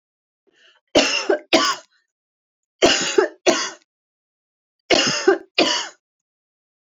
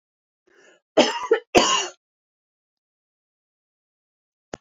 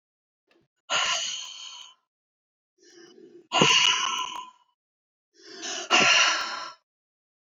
{"three_cough_length": "6.9 s", "three_cough_amplitude": 28602, "three_cough_signal_mean_std_ratio": 0.4, "cough_length": "4.6 s", "cough_amplitude": 27003, "cough_signal_mean_std_ratio": 0.27, "exhalation_length": "7.5 s", "exhalation_amplitude": 22187, "exhalation_signal_mean_std_ratio": 0.43, "survey_phase": "alpha (2021-03-01 to 2021-08-12)", "age": "65+", "gender": "Female", "wearing_mask": "No", "symptom_none": true, "smoker_status": "Ex-smoker", "respiratory_condition_asthma": false, "respiratory_condition_other": false, "recruitment_source": "REACT", "submission_delay": "1 day", "covid_test_result": "Negative", "covid_test_method": "RT-qPCR"}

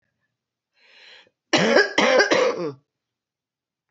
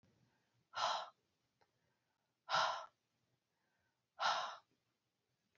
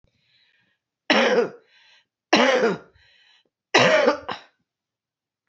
{"cough_length": "3.9 s", "cough_amplitude": 24979, "cough_signal_mean_std_ratio": 0.43, "exhalation_length": "5.6 s", "exhalation_amplitude": 2039, "exhalation_signal_mean_std_ratio": 0.33, "three_cough_length": "5.5 s", "three_cough_amplitude": 26698, "three_cough_signal_mean_std_ratio": 0.4, "survey_phase": "alpha (2021-03-01 to 2021-08-12)", "age": "45-64", "gender": "Female", "wearing_mask": "No", "symptom_cough_any": true, "symptom_fatigue": true, "symptom_headache": true, "symptom_change_to_sense_of_smell_or_taste": true, "symptom_loss_of_taste": true, "symptom_onset": "4 days", "smoker_status": "Never smoked", "respiratory_condition_asthma": false, "respiratory_condition_other": false, "recruitment_source": "Test and Trace", "submission_delay": "1 day", "covid_test_result": "Positive", "covid_test_method": "RT-qPCR", "covid_ct_value": 16.0, "covid_ct_gene": "ORF1ab gene", "covid_ct_mean": 16.1, "covid_viral_load": "5300000 copies/ml", "covid_viral_load_category": "High viral load (>1M copies/ml)"}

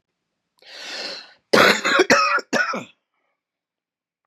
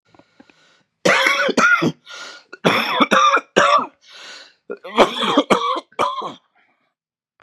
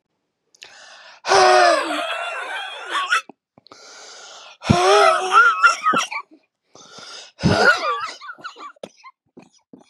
{"cough_length": "4.3 s", "cough_amplitude": 32207, "cough_signal_mean_std_ratio": 0.42, "three_cough_length": "7.4 s", "three_cough_amplitude": 32768, "three_cough_signal_mean_std_ratio": 0.52, "exhalation_length": "9.9 s", "exhalation_amplitude": 32577, "exhalation_signal_mean_std_ratio": 0.5, "survey_phase": "beta (2021-08-13 to 2022-03-07)", "age": "45-64", "gender": "Male", "wearing_mask": "No", "symptom_cough_any": true, "symptom_sore_throat": true, "symptom_other": true, "symptom_onset": "2 days", "smoker_status": "Never smoked", "respiratory_condition_asthma": true, "respiratory_condition_other": false, "recruitment_source": "Test and Trace", "submission_delay": "1 day", "covid_test_result": "Positive", "covid_test_method": "RT-qPCR", "covid_ct_value": 18.9, "covid_ct_gene": "N gene"}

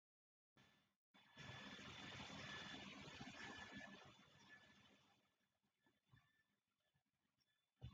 {"exhalation_length": "7.9 s", "exhalation_amplitude": 243, "exhalation_signal_mean_std_ratio": 0.6, "survey_phase": "beta (2021-08-13 to 2022-03-07)", "age": "65+", "gender": "Female", "wearing_mask": "No", "symptom_none": true, "smoker_status": "Never smoked", "respiratory_condition_asthma": false, "respiratory_condition_other": false, "recruitment_source": "REACT", "submission_delay": "2 days", "covid_test_result": "Negative", "covid_test_method": "RT-qPCR"}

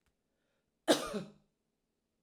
{"cough_length": "2.2 s", "cough_amplitude": 7266, "cough_signal_mean_std_ratio": 0.24, "survey_phase": "alpha (2021-03-01 to 2021-08-12)", "age": "65+", "gender": "Female", "wearing_mask": "No", "symptom_none": true, "smoker_status": "Never smoked", "respiratory_condition_asthma": false, "respiratory_condition_other": false, "recruitment_source": "REACT", "submission_delay": "2 days", "covid_test_result": "Negative", "covid_test_method": "RT-qPCR"}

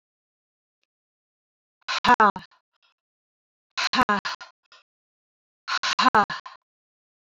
{"exhalation_length": "7.3 s", "exhalation_amplitude": 21794, "exhalation_signal_mean_std_ratio": 0.29, "survey_phase": "beta (2021-08-13 to 2022-03-07)", "age": "45-64", "gender": "Female", "wearing_mask": "No", "symptom_none": true, "symptom_onset": "6 days", "smoker_status": "Never smoked", "respiratory_condition_asthma": false, "respiratory_condition_other": false, "recruitment_source": "REACT", "submission_delay": "1 day", "covid_test_result": "Negative", "covid_test_method": "RT-qPCR", "influenza_a_test_result": "Unknown/Void", "influenza_b_test_result": "Unknown/Void"}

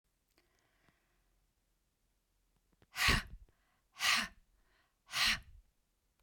{"exhalation_length": "6.2 s", "exhalation_amplitude": 6016, "exhalation_signal_mean_std_ratio": 0.29, "survey_phase": "beta (2021-08-13 to 2022-03-07)", "age": "45-64", "gender": "Female", "wearing_mask": "No", "symptom_none": true, "symptom_onset": "7 days", "smoker_status": "Ex-smoker", "respiratory_condition_asthma": false, "respiratory_condition_other": false, "recruitment_source": "REACT", "submission_delay": "0 days", "covid_test_result": "Negative", "covid_test_method": "RT-qPCR"}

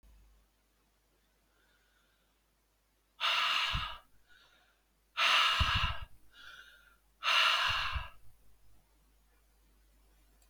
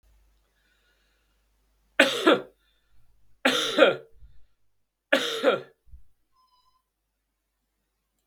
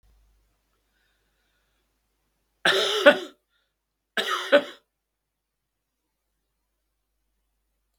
{"exhalation_length": "10.5 s", "exhalation_amplitude": 6110, "exhalation_signal_mean_std_ratio": 0.41, "three_cough_length": "8.3 s", "three_cough_amplitude": 32767, "three_cough_signal_mean_std_ratio": 0.29, "cough_length": "8.0 s", "cough_amplitude": 32767, "cough_signal_mean_std_ratio": 0.23, "survey_phase": "beta (2021-08-13 to 2022-03-07)", "age": "65+", "gender": "Male", "wearing_mask": "No", "symptom_cough_any": true, "symptom_fatigue": true, "symptom_headache": true, "smoker_status": "Never smoked", "respiratory_condition_asthma": false, "respiratory_condition_other": false, "recruitment_source": "Test and Trace", "submission_delay": "2 days", "covid_test_result": "Positive", "covid_test_method": "LFT"}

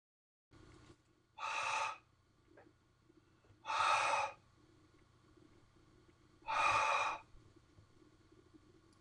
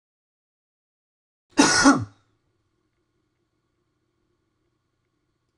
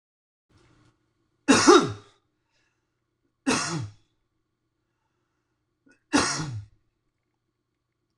{"exhalation_length": "9.0 s", "exhalation_amplitude": 2961, "exhalation_signal_mean_std_ratio": 0.41, "cough_length": "5.6 s", "cough_amplitude": 24874, "cough_signal_mean_std_ratio": 0.22, "three_cough_length": "8.2 s", "three_cough_amplitude": 22244, "three_cough_signal_mean_std_ratio": 0.26, "survey_phase": "alpha (2021-03-01 to 2021-08-12)", "age": "45-64", "gender": "Male", "wearing_mask": "No", "symptom_none": true, "smoker_status": "Never smoked", "respiratory_condition_asthma": false, "respiratory_condition_other": false, "recruitment_source": "REACT", "submission_delay": "1 day", "covid_test_result": "Negative", "covid_test_method": "RT-qPCR"}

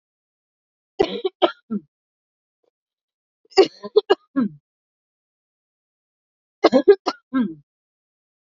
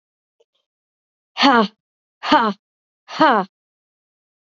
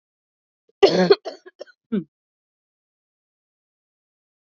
{"three_cough_length": "8.5 s", "three_cough_amplitude": 28030, "three_cough_signal_mean_std_ratio": 0.25, "exhalation_length": "4.4 s", "exhalation_amplitude": 32697, "exhalation_signal_mean_std_ratio": 0.31, "cough_length": "4.4 s", "cough_amplitude": 28968, "cough_signal_mean_std_ratio": 0.22, "survey_phase": "beta (2021-08-13 to 2022-03-07)", "age": "18-44", "gender": "Female", "wearing_mask": "No", "symptom_cough_any": true, "symptom_runny_or_blocked_nose": true, "symptom_shortness_of_breath": true, "symptom_sore_throat": true, "symptom_fatigue": true, "symptom_headache": true, "smoker_status": "Never smoked", "respiratory_condition_asthma": true, "respiratory_condition_other": false, "recruitment_source": "Test and Trace", "submission_delay": "2 days", "covid_test_result": "Positive", "covid_test_method": "LFT"}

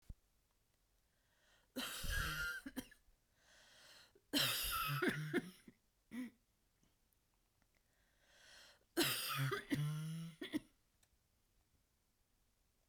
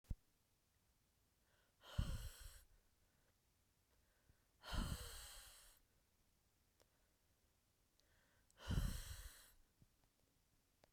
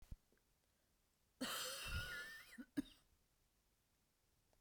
{"three_cough_length": "12.9 s", "three_cough_amplitude": 2241, "three_cough_signal_mean_std_ratio": 0.46, "exhalation_length": "10.9 s", "exhalation_amplitude": 1399, "exhalation_signal_mean_std_ratio": 0.33, "cough_length": "4.6 s", "cough_amplitude": 848, "cough_signal_mean_std_ratio": 0.43, "survey_phase": "beta (2021-08-13 to 2022-03-07)", "age": "45-64", "gender": "Female", "wearing_mask": "No", "symptom_cough_any": true, "symptom_runny_or_blocked_nose": true, "symptom_shortness_of_breath": true, "symptom_sore_throat": true, "symptom_fatigue": true, "symptom_headache": true, "smoker_status": "Never smoked", "respiratory_condition_asthma": false, "respiratory_condition_other": false, "recruitment_source": "Test and Trace", "submission_delay": "2 days", "covid_test_result": "Positive", "covid_test_method": "RT-qPCR", "covid_ct_value": 21.7, "covid_ct_gene": "N gene"}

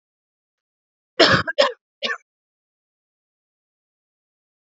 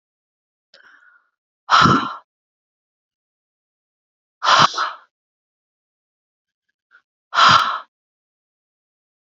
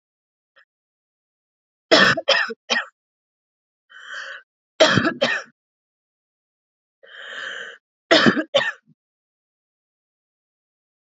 {"cough_length": "4.6 s", "cough_amplitude": 28669, "cough_signal_mean_std_ratio": 0.24, "exhalation_length": "9.4 s", "exhalation_amplitude": 29008, "exhalation_signal_mean_std_ratio": 0.27, "three_cough_length": "11.2 s", "three_cough_amplitude": 29153, "three_cough_signal_mean_std_ratio": 0.3, "survey_phase": "beta (2021-08-13 to 2022-03-07)", "age": "18-44", "gender": "Female", "wearing_mask": "No", "symptom_cough_any": true, "symptom_runny_or_blocked_nose": true, "symptom_abdominal_pain": true, "symptom_headache": true, "symptom_change_to_sense_of_smell_or_taste": true, "symptom_onset": "3 days", "smoker_status": "Never smoked", "respiratory_condition_asthma": false, "respiratory_condition_other": false, "recruitment_source": "Test and Trace", "submission_delay": "2 days", "covid_test_result": "Positive", "covid_test_method": "RT-qPCR", "covid_ct_value": 17.3, "covid_ct_gene": "N gene", "covid_ct_mean": 17.7, "covid_viral_load": "1500000 copies/ml", "covid_viral_load_category": "High viral load (>1M copies/ml)"}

